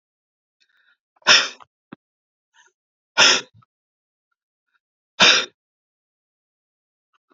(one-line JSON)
{"exhalation_length": "7.3 s", "exhalation_amplitude": 32768, "exhalation_signal_mean_std_ratio": 0.23, "survey_phase": "beta (2021-08-13 to 2022-03-07)", "age": "65+", "gender": "Male", "wearing_mask": "No", "symptom_fatigue": true, "symptom_onset": "11 days", "smoker_status": "Ex-smoker", "respiratory_condition_asthma": true, "respiratory_condition_other": false, "recruitment_source": "REACT", "submission_delay": "3 days", "covid_test_result": "Negative", "covid_test_method": "RT-qPCR", "influenza_a_test_result": "Negative", "influenza_b_test_result": "Negative"}